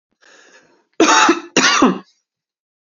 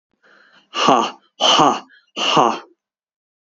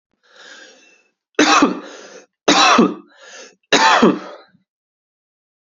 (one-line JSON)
{"cough_length": "2.8 s", "cough_amplitude": 32767, "cough_signal_mean_std_ratio": 0.45, "exhalation_length": "3.5 s", "exhalation_amplitude": 31018, "exhalation_signal_mean_std_ratio": 0.45, "three_cough_length": "5.7 s", "three_cough_amplitude": 32242, "three_cough_signal_mean_std_ratio": 0.41, "survey_phase": "beta (2021-08-13 to 2022-03-07)", "age": "18-44", "gender": "Male", "wearing_mask": "No", "symptom_cough_any": true, "symptom_runny_or_blocked_nose": true, "symptom_sore_throat": true, "smoker_status": "Never smoked", "respiratory_condition_asthma": true, "respiratory_condition_other": false, "recruitment_source": "Test and Trace", "submission_delay": "1 day", "covid_test_result": "Positive", "covid_test_method": "RT-qPCR", "covid_ct_value": 17.7, "covid_ct_gene": "N gene"}